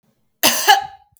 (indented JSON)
{
  "cough_length": "1.2 s",
  "cough_amplitude": 32768,
  "cough_signal_mean_std_ratio": 0.43,
  "survey_phase": "beta (2021-08-13 to 2022-03-07)",
  "age": "45-64",
  "gender": "Female",
  "wearing_mask": "No",
  "symptom_none": true,
  "symptom_onset": "12 days",
  "smoker_status": "Ex-smoker",
  "respiratory_condition_asthma": false,
  "respiratory_condition_other": false,
  "recruitment_source": "REACT",
  "submission_delay": "2 days",
  "covid_test_result": "Negative",
  "covid_test_method": "RT-qPCR",
  "influenza_a_test_result": "Unknown/Void",
  "influenza_b_test_result": "Unknown/Void"
}